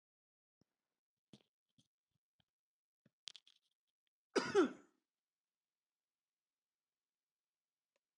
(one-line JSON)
{"cough_length": "8.2 s", "cough_amplitude": 2609, "cough_signal_mean_std_ratio": 0.15, "survey_phase": "alpha (2021-03-01 to 2021-08-12)", "age": "45-64", "gender": "Male", "wearing_mask": "No", "symptom_none": true, "smoker_status": "Ex-smoker", "respiratory_condition_asthma": false, "respiratory_condition_other": false, "recruitment_source": "REACT", "submission_delay": "1 day", "covid_test_result": "Negative", "covid_test_method": "RT-qPCR"}